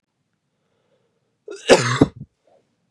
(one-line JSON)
{"cough_length": "2.9 s", "cough_amplitude": 32768, "cough_signal_mean_std_ratio": 0.25, "survey_phase": "beta (2021-08-13 to 2022-03-07)", "age": "18-44", "gender": "Male", "wearing_mask": "No", "symptom_runny_or_blocked_nose": true, "symptom_fatigue": true, "symptom_change_to_sense_of_smell_or_taste": true, "smoker_status": "Never smoked", "respiratory_condition_asthma": true, "respiratory_condition_other": false, "recruitment_source": "Test and Trace", "submission_delay": "1 day", "covid_test_result": "Positive", "covid_test_method": "RT-qPCR"}